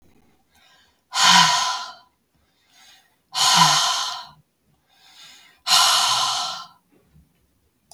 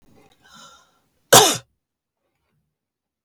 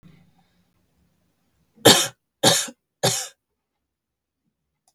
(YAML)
exhalation_length: 7.9 s
exhalation_amplitude: 28466
exhalation_signal_mean_std_ratio: 0.44
cough_length: 3.2 s
cough_amplitude: 32768
cough_signal_mean_std_ratio: 0.2
three_cough_length: 4.9 s
three_cough_amplitude: 32768
three_cough_signal_mean_std_ratio: 0.25
survey_phase: beta (2021-08-13 to 2022-03-07)
age: 45-64
gender: Female
wearing_mask: 'No'
symptom_none: true
smoker_status: Never smoked
respiratory_condition_asthma: false
respiratory_condition_other: false
recruitment_source: REACT
submission_delay: 1 day
covid_test_result: Negative
covid_test_method: RT-qPCR
influenza_a_test_result: Negative
influenza_b_test_result: Negative